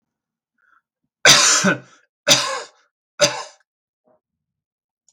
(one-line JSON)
{"three_cough_length": "5.1 s", "three_cough_amplitude": 32768, "three_cough_signal_mean_std_ratio": 0.33, "survey_phase": "beta (2021-08-13 to 2022-03-07)", "age": "45-64", "gender": "Male", "wearing_mask": "No", "symptom_none": true, "smoker_status": "Never smoked", "respiratory_condition_asthma": false, "respiratory_condition_other": false, "recruitment_source": "REACT", "submission_delay": "2 days", "covid_test_result": "Negative", "covid_test_method": "RT-qPCR", "influenza_a_test_result": "Negative", "influenza_b_test_result": "Negative"}